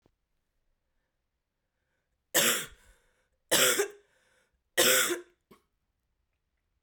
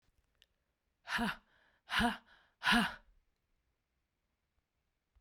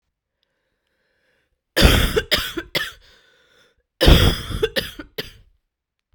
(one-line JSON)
{"three_cough_length": "6.8 s", "three_cough_amplitude": 11757, "three_cough_signal_mean_std_ratio": 0.31, "exhalation_length": "5.2 s", "exhalation_amplitude": 4402, "exhalation_signal_mean_std_ratio": 0.3, "cough_length": "6.1 s", "cough_amplitude": 32768, "cough_signal_mean_std_ratio": 0.35, "survey_phase": "beta (2021-08-13 to 2022-03-07)", "age": "18-44", "gender": "Female", "wearing_mask": "No", "symptom_cough_any": true, "symptom_runny_or_blocked_nose": true, "symptom_shortness_of_breath": true, "symptom_sore_throat": true, "symptom_abdominal_pain": true, "symptom_fatigue": true, "symptom_headache": true, "symptom_other": true, "symptom_onset": "4 days", "smoker_status": "Never smoked", "respiratory_condition_asthma": true, "respiratory_condition_other": false, "recruitment_source": "Test and Trace", "submission_delay": "2 days", "covid_test_result": "Positive", "covid_test_method": "RT-qPCR"}